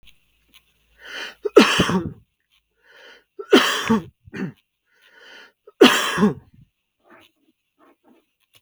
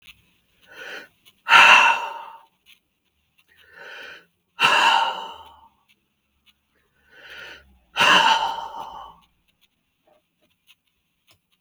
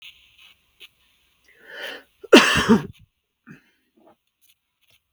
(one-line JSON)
{"three_cough_length": "8.6 s", "three_cough_amplitude": 32768, "three_cough_signal_mean_std_ratio": 0.31, "exhalation_length": "11.6 s", "exhalation_amplitude": 32768, "exhalation_signal_mean_std_ratio": 0.32, "cough_length": "5.1 s", "cough_amplitude": 32768, "cough_signal_mean_std_ratio": 0.23, "survey_phase": "beta (2021-08-13 to 2022-03-07)", "age": "45-64", "gender": "Male", "wearing_mask": "No", "symptom_none": true, "smoker_status": "Ex-smoker", "respiratory_condition_asthma": false, "respiratory_condition_other": false, "recruitment_source": "REACT", "submission_delay": "3 days", "covid_test_result": "Negative", "covid_test_method": "RT-qPCR"}